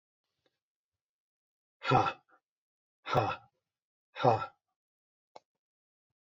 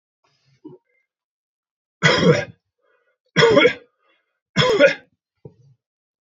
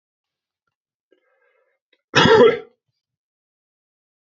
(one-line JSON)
{"exhalation_length": "6.2 s", "exhalation_amplitude": 7438, "exhalation_signal_mean_std_ratio": 0.26, "three_cough_length": "6.2 s", "three_cough_amplitude": 28523, "three_cough_signal_mean_std_ratio": 0.35, "cough_length": "4.4 s", "cough_amplitude": 28918, "cough_signal_mean_std_ratio": 0.25, "survey_phase": "beta (2021-08-13 to 2022-03-07)", "age": "45-64", "gender": "Male", "wearing_mask": "No", "symptom_runny_or_blocked_nose": true, "symptom_headache": true, "smoker_status": "Never smoked", "respiratory_condition_asthma": false, "respiratory_condition_other": false, "recruitment_source": "Test and Trace", "submission_delay": "2 days", "covid_test_result": "Positive", "covid_test_method": "LFT"}